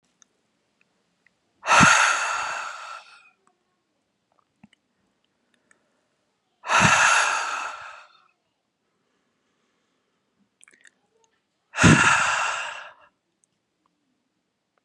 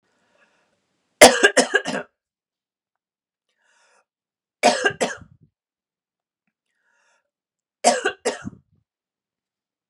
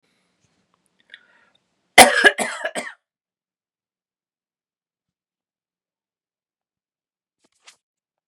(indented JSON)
{
  "exhalation_length": "14.8 s",
  "exhalation_amplitude": 26672,
  "exhalation_signal_mean_std_ratio": 0.33,
  "three_cough_length": "9.9 s",
  "three_cough_amplitude": 32768,
  "three_cough_signal_mean_std_ratio": 0.23,
  "cough_length": "8.3 s",
  "cough_amplitude": 32768,
  "cough_signal_mean_std_ratio": 0.16,
  "survey_phase": "beta (2021-08-13 to 2022-03-07)",
  "age": "18-44",
  "gender": "Male",
  "wearing_mask": "No",
  "symptom_sore_throat": true,
  "symptom_onset": "12 days",
  "smoker_status": "Never smoked",
  "respiratory_condition_asthma": false,
  "respiratory_condition_other": false,
  "recruitment_source": "REACT",
  "submission_delay": "3 days",
  "covid_test_result": "Negative",
  "covid_test_method": "RT-qPCR",
  "influenza_a_test_result": "Negative",
  "influenza_b_test_result": "Negative"
}